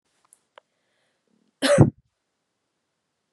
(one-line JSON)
{"cough_length": "3.3 s", "cough_amplitude": 29261, "cough_signal_mean_std_ratio": 0.21, "survey_phase": "beta (2021-08-13 to 2022-03-07)", "age": "18-44", "gender": "Female", "wearing_mask": "No", "symptom_cough_any": true, "symptom_runny_or_blocked_nose": true, "symptom_shortness_of_breath": true, "symptom_sore_throat": true, "symptom_fatigue": true, "symptom_fever_high_temperature": true, "symptom_headache": true, "symptom_other": true, "smoker_status": "Never smoked", "respiratory_condition_asthma": false, "respiratory_condition_other": false, "recruitment_source": "Test and Trace", "submission_delay": "1 day", "covid_test_result": "Positive", "covid_test_method": "RT-qPCR"}